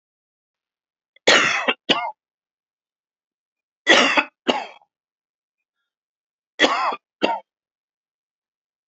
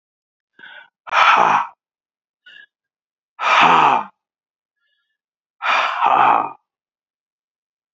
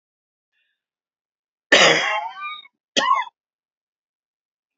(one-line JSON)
{"three_cough_length": "8.9 s", "three_cough_amplitude": 30591, "three_cough_signal_mean_std_ratio": 0.31, "exhalation_length": "7.9 s", "exhalation_amplitude": 32767, "exhalation_signal_mean_std_ratio": 0.41, "cough_length": "4.8 s", "cough_amplitude": 30678, "cough_signal_mean_std_ratio": 0.32, "survey_phase": "beta (2021-08-13 to 2022-03-07)", "age": "65+", "gender": "Male", "wearing_mask": "No", "symptom_cough_any": true, "symptom_onset": "8 days", "smoker_status": "Ex-smoker", "respiratory_condition_asthma": false, "respiratory_condition_other": false, "recruitment_source": "REACT", "submission_delay": "1 day", "covid_test_result": "Negative", "covid_test_method": "RT-qPCR"}